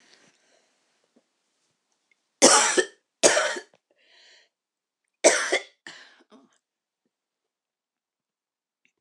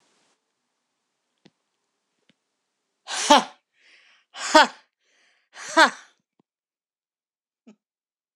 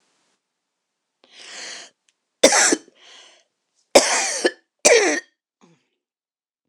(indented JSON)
{
  "three_cough_length": "9.0 s",
  "three_cough_amplitude": 25471,
  "three_cough_signal_mean_std_ratio": 0.25,
  "exhalation_length": "8.4 s",
  "exhalation_amplitude": 26027,
  "exhalation_signal_mean_std_ratio": 0.19,
  "cough_length": "6.7 s",
  "cough_amplitude": 26028,
  "cough_signal_mean_std_ratio": 0.32,
  "survey_phase": "beta (2021-08-13 to 2022-03-07)",
  "age": "65+",
  "gender": "Female",
  "wearing_mask": "No",
  "symptom_cough_any": true,
  "smoker_status": "Ex-smoker",
  "respiratory_condition_asthma": false,
  "respiratory_condition_other": true,
  "recruitment_source": "Test and Trace",
  "submission_delay": "1 day",
  "covid_test_result": "Negative",
  "covid_test_method": "LFT"
}